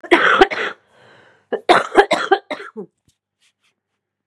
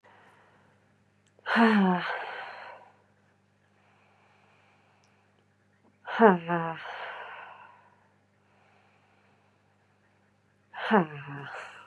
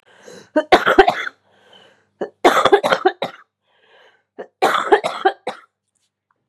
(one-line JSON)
{"cough_length": "4.3 s", "cough_amplitude": 32768, "cough_signal_mean_std_ratio": 0.38, "exhalation_length": "11.9 s", "exhalation_amplitude": 22881, "exhalation_signal_mean_std_ratio": 0.3, "three_cough_length": "6.5 s", "three_cough_amplitude": 32768, "three_cough_signal_mean_std_ratio": 0.38, "survey_phase": "beta (2021-08-13 to 2022-03-07)", "age": "18-44", "gender": "Female", "wearing_mask": "No", "symptom_cough_any": true, "symptom_runny_or_blocked_nose": true, "symptom_sore_throat": true, "symptom_fatigue": true, "symptom_onset": "12 days", "smoker_status": "Current smoker (11 or more cigarettes per day)", "respiratory_condition_asthma": false, "respiratory_condition_other": false, "recruitment_source": "REACT", "submission_delay": "6 days", "covid_test_result": "Negative", "covid_test_method": "RT-qPCR", "influenza_a_test_result": "Negative", "influenza_b_test_result": "Negative"}